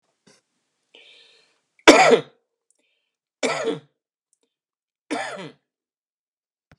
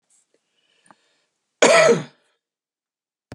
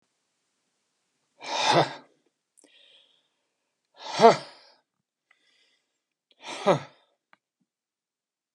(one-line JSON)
{"three_cough_length": "6.8 s", "three_cough_amplitude": 32768, "three_cough_signal_mean_std_ratio": 0.23, "cough_length": "3.3 s", "cough_amplitude": 32717, "cough_signal_mean_std_ratio": 0.28, "exhalation_length": "8.5 s", "exhalation_amplitude": 25450, "exhalation_signal_mean_std_ratio": 0.21, "survey_phase": "beta (2021-08-13 to 2022-03-07)", "age": "45-64", "gender": "Male", "wearing_mask": "No", "symptom_none": true, "smoker_status": "Ex-smoker", "respiratory_condition_asthma": false, "respiratory_condition_other": false, "recruitment_source": "REACT", "submission_delay": "2 days", "covid_test_result": "Negative", "covid_test_method": "RT-qPCR", "influenza_a_test_result": "Negative", "influenza_b_test_result": "Negative"}